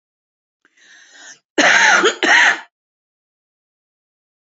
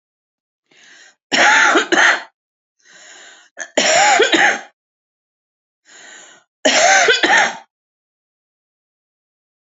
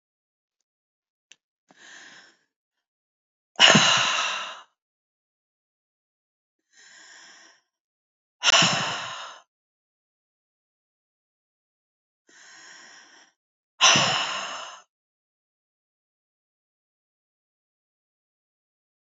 {"cough_length": "4.4 s", "cough_amplitude": 30742, "cough_signal_mean_std_ratio": 0.38, "three_cough_length": "9.6 s", "three_cough_amplitude": 31444, "three_cough_signal_mean_std_ratio": 0.44, "exhalation_length": "19.2 s", "exhalation_amplitude": 28433, "exhalation_signal_mean_std_ratio": 0.25, "survey_phase": "alpha (2021-03-01 to 2021-08-12)", "age": "45-64", "gender": "Female", "wearing_mask": "No", "symptom_none": true, "symptom_cough_any": true, "smoker_status": "Never smoked", "respiratory_condition_asthma": true, "respiratory_condition_other": false, "recruitment_source": "REACT", "submission_delay": "1 day", "covid_test_result": "Negative", "covid_test_method": "RT-qPCR"}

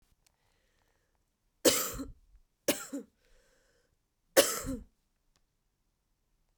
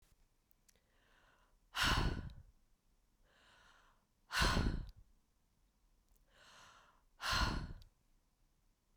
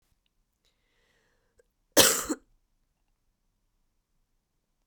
{"three_cough_length": "6.6 s", "three_cough_amplitude": 14591, "three_cough_signal_mean_std_ratio": 0.24, "exhalation_length": "9.0 s", "exhalation_amplitude": 2799, "exhalation_signal_mean_std_ratio": 0.35, "cough_length": "4.9 s", "cough_amplitude": 24053, "cough_signal_mean_std_ratio": 0.18, "survey_phase": "beta (2021-08-13 to 2022-03-07)", "age": "18-44", "gender": "Female", "wearing_mask": "No", "symptom_cough_any": true, "symptom_runny_or_blocked_nose": true, "symptom_sore_throat": true, "symptom_headache": true, "symptom_change_to_sense_of_smell_or_taste": true, "smoker_status": "Never smoked", "respiratory_condition_asthma": true, "respiratory_condition_other": false, "recruitment_source": "Test and Trace", "submission_delay": "2 days", "covid_test_result": "Positive", "covid_test_method": "RT-qPCR", "covid_ct_value": 21.4, "covid_ct_gene": "N gene", "covid_ct_mean": 21.7, "covid_viral_load": "74000 copies/ml", "covid_viral_load_category": "Low viral load (10K-1M copies/ml)"}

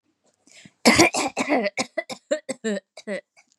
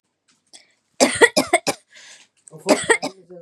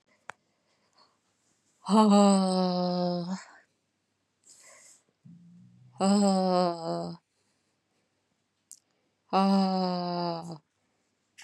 {"cough_length": "3.6 s", "cough_amplitude": 28130, "cough_signal_mean_std_ratio": 0.42, "three_cough_length": "3.4 s", "three_cough_amplitude": 32731, "three_cough_signal_mean_std_ratio": 0.34, "exhalation_length": "11.4 s", "exhalation_amplitude": 12277, "exhalation_signal_mean_std_ratio": 0.42, "survey_phase": "beta (2021-08-13 to 2022-03-07)", "age": "18-44", "gender": "Female", "wearing_mask": "Yes", "symptom_none": true, "symptom_onset": "12 days", "smoker_status": "Never smoked", "respiratory_condition_asthma": false, "respiratory_condition_other": false, "recruitment_source": "REACT", "submission_delay": "1 day", "covid_test_result": "Negative", "covid_test_method": "RT-qPCR", "influenza_a_test_result": "Negative", "influenza_b_test_result": "Negative"}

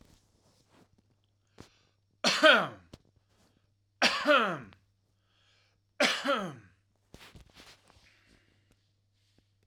{"three_cough_length": "9.7 s", "three_cough_amplitude": 16659, "three_cough_signal_mean_std_ratio": 0.29, "survey_phase": "alpha (2021-03-01 to 2021-08-12)", "age": "45-64", "gender": "Male", "wearing_mask": "No", "symptom_change_to_sense_of_smell_or_taste": true, "smoker_status": "Never smoked", "respiratory_condition_asthma": false, "respiratory_condition_other": false, "recruitment_source": "REACT", "submission_delay": "2 days", "covid_test_result": "Negative", "covid_test_method": "RT-qPCR"}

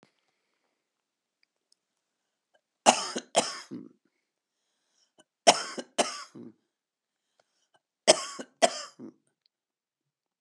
{"three_cough_length": "10.4 s", "three_cough_amplitude": 23956, "three_cough_signal_mean_std_ratio": 0.21, "survey_phase": "beta (2021-08-13 to 2022-03-07)", "age": "65+", "gender": "Female", "wearing_mask": "No", "symptom_shortness_of_breath": true, "symptom_fatigue": true, "symptom_headache": true, "symptom_change_to_sense_of_smell_or_taste": true, "symptom_other": true, "smoker_status": "Ex-smoker", "respiratory_condition_asthma": true, "respiratory_condition_other": true, "recruitment_source": "Test and Trace", "submission_delay": "2 days", "covid_test_result": "Positive", "covid_test_method": "LAMP"}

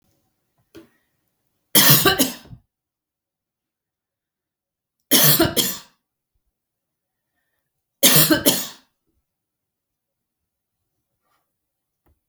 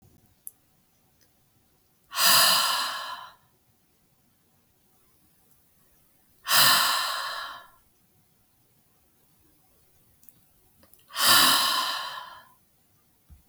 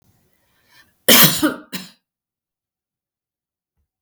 {"three_cough_length": "12.3 s", "three_cough_amplitude": 32768, "three_cough_signal_mean_std_ratio": 0.28, "exhalation_length": "13.5 s", "exhalation_amplitude": 17774, "exhalation_signal_mean_std_ratio": 0.36, "cough_length": "4.0 s", "cough_amplitude": 32768, "cough_signal_mean_std_ratio": 0.25, "survey_phase": "beta (2021-08-13 to 2022-03-07)", "age": "45-64", "gender": "Female", "wearing_mask": "No", "symptom_none": true, "smoker_status": "Ex-smoker", "respiratory_condition_asthma": false, "respiratory_condition_other": false, "recruitment_source": "REACT", "submission_delay": "2 days", "covid_test_result": "Negative", "covid_test_method": "RT-qPCR", "influenza_a_test_result": "Negative", "influenza_b_test_result": "Negative"}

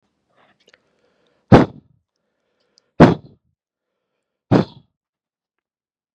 {"exhalation_length": "6.1 s", "exhalation_amplitude": 32768, "exhalation_signal_mean_std_ratio": 0.19, "survey_phase": "beta (2021-08-13 to 2022-03-07)", "age": "18-44", "gender": "Male", "wearing_mask": "No", "symptom_none": true, "smoker_status": "Never smoked", "respiratory_condition_asthma": false, "respiratory_condition_other": false, "recruitment_source": "Test and Trace", "submission_delay": "1 day", "covid_test_result": "Positive", "covid_test_method": "RT-qPCR", "covid_ct_value": 35.4, "covid_ct_gene": "N gene"}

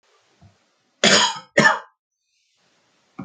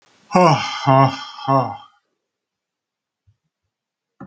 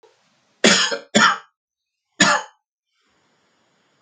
{"cough_length": "3.2 s", "cough_amplitude": 28474, "cough_signal_mean_std_ratio": 0.32, "exhalation_length": "4.3 s", "exhalation_amplitude": 32290, "exhalation_signal_mean_std_ratio": 0.37, "three_cough_length": "4.0 s", "three_cough_amplitude": 30681, "three_cough_signal_mean_std_ratio": 0.34, "survey_phase": "beta (2021-08-13 to 2022-03-07)", "age": "45-64", "gender": "Male", "wearing_mask": "No", "symptom_cough_any": true, "symptom_fever_high_temperature": true, "smoker_status": "Never smoked", "respiratory_condition_asthma": false, "respiratory_condition_other": false, "recruitment_source": "Test and Trace", "submission_delay": "1 day", "covid_test_result": "Positive", "covid_test_method": "RT-qPCR", "covid_ct_value": 15.0, "covid_ct_gene": "ORF1ab gene", "covid_ct_mean": 15.1, "covid_viral_load": "11000000 copies/ml", "covid_viral_load_category": "High viral load (>1M copies/ml)"}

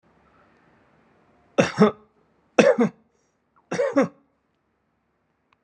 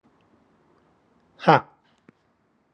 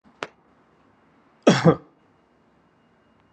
{"three_cough_length": "5.6 s", "three_cough_amplitude": 31684, "three_cough_signal_mean_std_ratio": 0.29, "exhalation_length": "2.7 s", "exhalation_amplitude": 31671, "exhalation_signal_mean_std_ratio": 0.17, "cough_length": "3.3 s", "cough_amplitude": 29188, "cough_signal_mean_std_ratio": 0.22, "survey_phase": "alpha (2021-03-01 to 2021-08-12)", "age": "45-64", "gender": "Male", "wearing_mask": "No", "symptom_shortness_of_breath": true, "symptom_fatigue": true, "symptom_onset": "12 days", "smoker_status": "Ex-smoker", "respiratory_condition_asthma": false, "respiratory_condition_other": false, "recruitment_source": "REACT", "submission_delay": "2 days", "covid_test_result": "Negative", "covid_test_method": "RT-qPCR"}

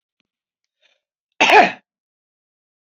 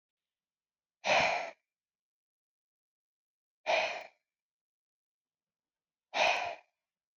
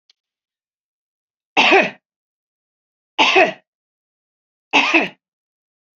{"cough_length": "2.8 s", "cough_amplitude": 28824, "cough_signal_mean_std_ratio": 0.25, "exhalation_length": "7.2 s", "exhalation_amplitude": 5715, "exhalation_signal_mean_std_ratio": 0.31, "three_cough_length": "6.0 s", "three_cough_amplitude": 31393, "three_cough_signal_mean_std_ratio": 0.31, "survey_phase": "beta (2021-08-13 to 2022-03-07)", "age": "65+", "gender": "Female", "wearing_mask": "No", "symptom_none": true, "smoker_status": "Never smoked", "respiratory_condition_asthma": false, "respiratory_condition_other": false, "recruitment_source": "REACT", "submission_delay": "2 days", "covid_test_result": "Negative", "covid_test_method": "RT-qPCR", "influenza_a_test_result": "Negative", "influenza_b_test_result": "Negative"}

